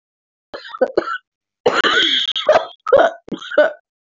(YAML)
cough_length: 4.1 s
cough_amplitude: 25862
cough_signal_mean_std_ratio: 0.51
survey_phase: beta (2021-08-13 to 2022-03-07)
age: 18-44
gender: Female
wearing_mask: 'No'
symptom_cough_any: true
symptom_runny_or_blocked_nose: true
symptom_shortness_of_breath: true
symptom_fatigue: true
symptom_other: true
symptom_onset: 4 days
smoker_status: Never smoked
respiratory_condition_asthma: false
respiratory_condition_other: false
recruitment_source: Test and Trace
submission_delay: 1 day
covid_test_result: Positive
covid_test_method: RT-qPCR
covid_ct_value: 16.2
covid_ct_gene: ORF1ab gene
covid_ct_mean: 16.6
covid_viral_load: 3600000 copies/ml
covid_viral_load_category: High viral load (>1M copies/ml)